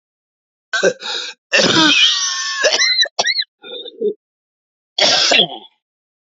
{"cough_length": "6.3 s", "cough_amplitude": 31766, "cough_signal_mean_std_ratio": 0.58, "survey_phase": "alpha (2021-03-01 to 2021-08-12)", "age": "45-64", "gender": "Male", "wearing_mask": "No", "symptom_cough_any": true, "symptom_new_continuous_cough": true, "symptom_shortness_of_breath": true, "symptom_fatigue": true, "symptom_fever_high_temperature": true, "symptom_headache": true, "symptom_onset": "3 days", "smoker_status": "Ex-smoker", "respiratory_condition_asthma": false, "respiratory_condition_other": false, "recruitment_source": "Test and Trace", "submission_delay": "1 day", "covid_test_result": "Positive", "covid_test_method": "RT-qPCR", "covid_ct_value": 15.8, "covid_ct_gene": "N gene", "covid_ct_mean": 16.0, "covid_viral_load": "5500000 copies/ml", "covid_viral_load_category": "High viral load (>1M copies/ml)"}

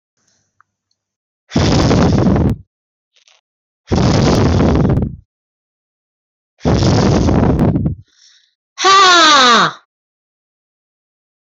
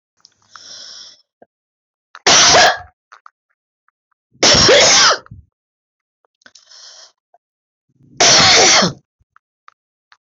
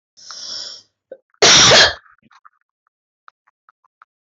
{"exhalation_length": "11.4 s", "exhalation_amplitude": 29374, "exhalation_signal_mean_std_ratio": 0.56, "three_cough_length": "10.3 s", "three_cough_amplitude": 29885, "three_cough_signal_mean_std_ratio": 0.41, "cough_length": "4.3 s", "cough_amplitude": 27246, "cough_signal_mean_std_ratio": 0.33, "survey_phase": "beta (2021-08-13 to 2022-03-07)", "age": "65+", "gender": "Female", "wearing_mask": "No", "symptom_cough_any": true, "symptom_abdominal_pain": true, "symptom_fatigue": true, "symptom_onset": "12 days", "smoker_status": "Ex-smoker", "respiratory_condition_asthma": false, "respiratory_condition_other": false, "recruitment_source": "REACT", "submission_delay": "6 days", "covid_test_result": "Negative", "covid_test_method": "RT-qPCR", "influenza_a_test_result": "Unknown/Void", "influenza_b_test_result": "Unknown/Void"}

